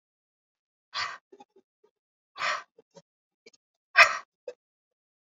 exhalation_length: 5.2 s
exhalation_amplitude: 23924
exhalation_signal_mean_std_ratio: 0.19
survey_phase: alpha (2021-03-01 to 2021-08-12)
age: 45-64
gender: Female
wearing_mask: 'No'
symptom_none: true
smoker_status: Never smoked
respiratory_condition_asthma: false
respiratory_condition_other: false
recruitment_source: REACT
submission_delay: 2 days
covid_test_result: Negative
covid_test_method: RT-qPCR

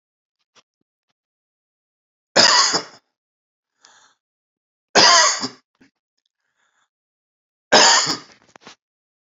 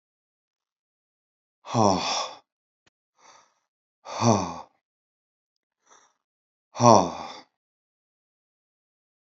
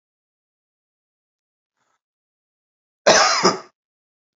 three_cough_length: 9.4 s
three_cough_amplitude: 32767
three_cough_signal_mean_std_ratio: 0.3
exhalation_length: 9.4 s
exhalation_amplitude: 27348
exhalation_signal_mean_std_ratio: 0.25
cough_length: 4.4 s
cough_amplitude: 27684
cough_signal_mean_std_ratio: 0.25
survey_phase: beta (2021-08-13 to 2022-03-07)
age: 45-64
gender: Male
wearing_mask: 'No'
symptom_none: true
smoker_status: Ex-smoker
respiratory_condition_asthma: false
respiratory_condition_other: false
recruitment_source: REACT
submission_delay: 2 days
covid_test_result: Negative
covid_test_method: RT-qPCR
influenza_a_test_result: Unknown/Void
influenza_b_test_result: Unknown/Void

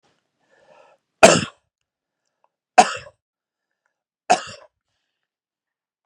three_cough_length: 6.1 s
three_cough_amplitude: 32768
three_cough_signal_mean_std_ratio: 0.18
survey_phase: beta (2021-08-13 to 2022-03-07)
age: 45-64
gender: Male
wearing_mask: 'No'
symptom_none: true
smoker_status: Ex-smoker
respiratory_condition_asthma: false
respiratory_condition_other: false
recruitment_source: REACT
submission_delay: 0 days
covid_test_result: Negative
covid_test_method: RT-qPCR
influenza_a_test_result: Negative
influenza_b_test_result: Negative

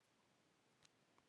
cough_length: 1.3 s
cough_amplitude: 154
cough_signal_mean_std_ratio: 0.92
survey_phase: beta (2021-08-13 to 2022-03-07)
age: 18-44
gender: Female
wearing_mask: 'Yes'
symptom_cough_any: true
symptom_runny_or_blocked_nose: true
symptom_shortness_of_breath: true
symptom_sore_throat: true
symptom_fatigue: true
symptom_change_to_sense_of_smell_or_taste: true
symptom_loss_of_taste: true
smoker_status: Never smoked
respiratory_condition_asthma: false
respiratory_condition_other: false
recruitment_source: Test and Trace
submission_delay: 3 days
covid_test_result: Positive
covid_test_method: RT-qPCR
covid_ct_value: 20.5
covid_ct_gene: ORF1ab gene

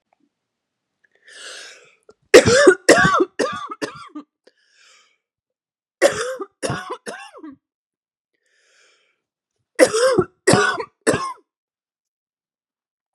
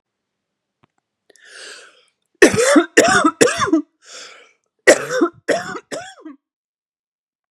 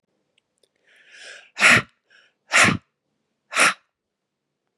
three_cough_length: 13.1 s
three_cough_amplitude: 32768
three_cough_signal_mean_std_ratio: 0.32
cough_length: 7.5 s
cough_amplitude: 32768
cough_signal_mean_std_ratio: 0.37
exhalation_length: 4.8 s
exhalation_amplitude: 27851
exhalation_signal_mean_std_ratio: 0.29
survey_phase: beta (2021-08-13 to 2022-03-07)
age: 18-44
gender: Female
wearing_mask: 'No'
symptom_cough_any: true
symptom_runny_or_blocked_nose: true
symptom_sore_throat: true
symptom_fatigue: true
symptom_headache: true
symptom_onset: 13 days
smoker_status: Ex-smoker
respiratory_condition_asthma: false
respiratory_condition_other: false
recruitment_source: REACT
submission_delay: 1 day
covid_test_result: Negative
covid_test_method: RT-qPCR
influenza_a_test_result: Negative
influenza_b_test_result: Negative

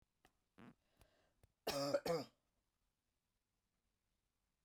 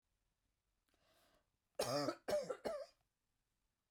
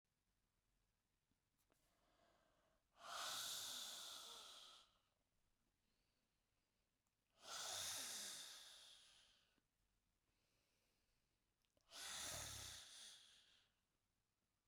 cough_length: 4.6 s
cough_amplitude: 1783
cough_signal_mean_std_ratio: 0.28
three_cough_length: 3.9 s
three_cough_amplitude: 1644
three_cough_signal_mean_std_ratio: 0.37
exhalation_length: 14.7 s
exhalation_amplitude: 452
exhalation_signal_mean_std_ratio: 0.47
survey_phase: beta (2021-08-13 to 2022-03-07)
age: 45-64
gender: Female
wearing_mask: 'No'
symptom_none: true
smoker_status: Ex-smoker
respiratory_condition_asthma: false
respiratory_condition_other: false
recruitment_source: REACT
submission_delay: 2 days
covid_test_result: Negative
covid_test_method: RT-qPCR
covid_ct_value: 38.8
covid_ct_gene: N gene
influenza_a_test_result: Negative
influenza_b_test_result: Negative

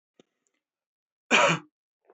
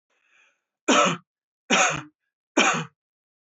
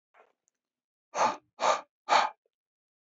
cough_length: 2.1 s
cough_amplitude: 16354
cough_signal_mean_std_ratio: 0.28
three_cough_length: 3.4 s
three_cough_amplitude: 23299
three_cough_signal_mean_std_ratio: 0.4
exhalation_length: 3.2 s
exhalation_amplitude: 11958
exhalation_signal_mean_std_ratio: 0.33
survey_phase: alpha (2021-03-01 to 2021-08-12)
age: 18-44
gender: Male
wearing_mask: 'No'
symptom_none: true
smoker_status: Never smoked
respiratory_condition_asthma: false
respiratory_condition_other: false
recruitment_source: REACT
submission_delay: 3 days
covid_test_result: Negative
covid_test_method: RT-qPCR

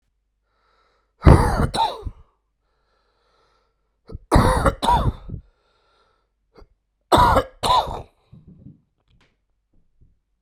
three_cough_length: 10.4 s
three_cough_amplitude: 32768
three_cough_signal_mean_std_ratio: 0.34
survey_phase: beta (2021-08-13 to 2022-03-07)
age: 45-64
gender: Male
wearing_mask: 'No'
symptom_cough_any: true
symptom_runny_or_blocked_nose: true
symptom_fever_high_temperature: true
symptom_headache: true
symptom_change_to_sense_of_smell_or_taste: true
symptom_loss_of_taste: true
symptom_onset: 3 days
smoker_status: Never smoked
respiratory_condition_asthma: false
respiratory_condition_other: false
recruitment_source: Test and Trace
submission_delay: 1 day
covid_test_result: Positive
covid_test_method: RT-qPCR
covid_ct_value: 16.2
covid_ct_gene: ORF1ab gene
covid_ct_mean: 16.6
covid_viral_load: 3700000 copies/ml
covid_viral_load_category: High viral load (>1M copies/ml)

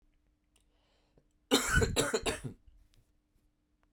cough_length: 3.9 s
cough_amplitude: 7912
cough_signal_mean_std_ratio: 0.36
survey_phase: beta (2021-08-13 to 2022-03-07)
age: 18-44
gender: Male
wearing_mask: 'No'
symptom_cough_any: true
symptom_runny_or_blocked_nose: true
symptom_onset: 5 days
smoker_status: Never smoked
respiratory_condition_asthma: false
respiratory_condition_other: false
recruitment_source: REACT
submission_delay: 1 day
covid_test_result: Negative
covid_test_method: RT-qPCR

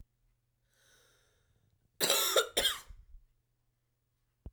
cough_length: 4.5 s
cough_amplitude: 6768
cough_signal_mean_std_ratio: 0.31
survey_phase: beta (2021-08-13 to 2022-03-07)
age: 18-44
gender: Female
wearing_mask: 'No'
symptom_cough_any: true
symptom_runny_or_blocked_nose: true
symptom_shortness_of_breath: true
symptom_fatigue: true
symptom_headache: true
symptom_change_to_sense_of_smell_or_taste: true
symptom_loss_of_taste: true
symptom_onset: 3 days
smoker_status: Never smoked
respiratory_condition_asthma: true
respiratory_condition_other: false
recruitment_source: Test and Trace
submission_delay: 1 day
covid_test_result: Positive
covid_test_method: ePCR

